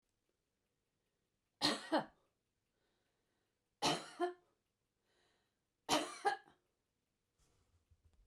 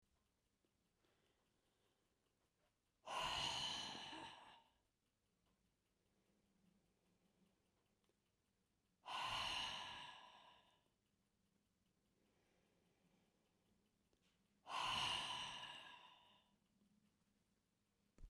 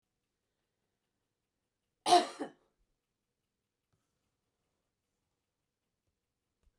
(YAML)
three_cough_length: 8.3 s
three_cough_amplitude: 4080
three_cough_signal_mean_std_ratio: 0.27
exhalation_length: 18.3 s
exhalation_amplitude: 757
exhalation_signal_mean_std_ratio: 0.38
cough_length: 6.8 s
cough_amplitude: 8017
cough_signal_mean_std_ratio: 0.14
survey_phase: beta (2021-08-13 to 2022-03-07)
age: 65+
gender: Female
wearing_mask: 'No'
symptom_headache: true
smoker_status: Never smoked
respiratory_condition_asthma: false
respiratory_condition_other: false
recruitment_source: REACT
submission_delay: 3 days
covid_test_result: Negative
covid_test_method: RT-qPCR
influenza_a_test_result: Unknown/Void
influenza_b_test_result: Unknown/Void